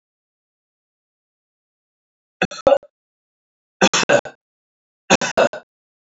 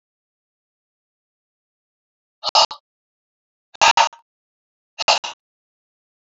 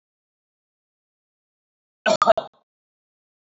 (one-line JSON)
{"three_cough_length": "6.1 s", "three_cough_amplitude": 32461, "three_cough_signal_mean_std_ratio": 0.26, "exhalation_length": "6.3 s", "exhalation_amplitude": 31766, "exhalation_signal_mean_std_ratio": 0.22, "cough_length": "3.4 s", "cough_amplitude": 25283, "cough_signal_mean_std_ratio": 0.2, "survey_phase": "alpha (2021-03-01 to 2021-08-12)", "age": "65+", "gender": "Male", "wearing_mask": "No", "symptom_none": true, "smoker_status": "Never smoked", "respiratory_condition_asthma": false, "respiratory_condition_other": false, "recruitment_source": "REACT", "submission_delay": "2 days", "covid_test_result": "Negative", "covid_test_method": "RT-qPCR"}